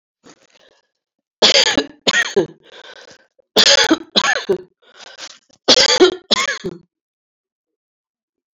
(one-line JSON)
{"three_cough_length": "8.5 s", "three_cough_amplitude": 32768, "three_cough_signal_mean_std_ratio": 0.39, "survey_phase": "alpha (2021-03-01 to 2021-08-12)", "age": "65+", "gender": "Female", "wearing_mask": "No", "symptom_cough_any": true, "symptom_onset": "4 days", "smoker_status": "Never smoked", "respiratory_condition_asthma": false, "respiratory_condition_other": false, "recruitment_source": "Test and Trace", "submission_delay": "2 days", "covid_test_result": "Positive", "covid_test_method": "RT-qPCR", "covid_ct_value": 15.5, "covid_ct_gene": "ORF1ab gene"}